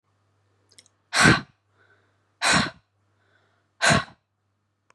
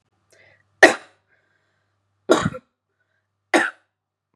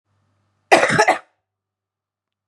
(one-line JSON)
{"exhalation_length": "4.9 s", "exhalation_amplitude": 26522, "exhalation_signal_mean_std_ratio": 0.3, "three_cough_length": "4.4 s", "three_cough_amplitude": 32768, "three_cough_signal_mean_std_ratio": 0.22, "cough_length": "2.5 s", "cough_amplitude": 32767, "cough_signal_mean_std_ratio": 0.31, "survey_phase": "beta (2021-08-13 to 2022-03-07)", "age": "18-44", "gender": "Female", "wearing_mask": "No", "symptom_none": true, "smoker_status": "Current smoker (11 or more cigarettes per day)", "respiratory_condition_asthma": false, "respiratory_condition_other": false, "recruitment_source": "REACT", "submission_delay": "3 days", "covid_test_result": "Negative", "covid_test_method": "RT-qPCR", "influenza_a_test_result": "Negative", "influenza_b_test_result": "Negative"}